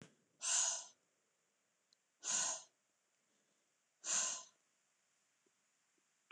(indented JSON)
{
  "exhalation_length": "6.3 s",
  "exhalation_amplitude": 2029,
  "exhalation_signal_mean_std_ratio": 0.35,
  "survey_phase": "beta (2021-08-13 to 2022-03-07)",
  "age": "45-64",
  "gender": "Female",
  "wearing_mask": "No",
  "symptom_none": true,
  "smoker_status": "Never smoked",
  "respiratory_condition_asthma": false,
  "respiratory_condition_other": false,
  "recruitment_source": "REACT",
  "submission_delay": "2 days",
  "covid_test_result": "Negative",
  "covid_test_method": "RT-qPCR",
  "influenza_a_test_result": "Negative",
  "influenza_b_test_result": "Negative"
}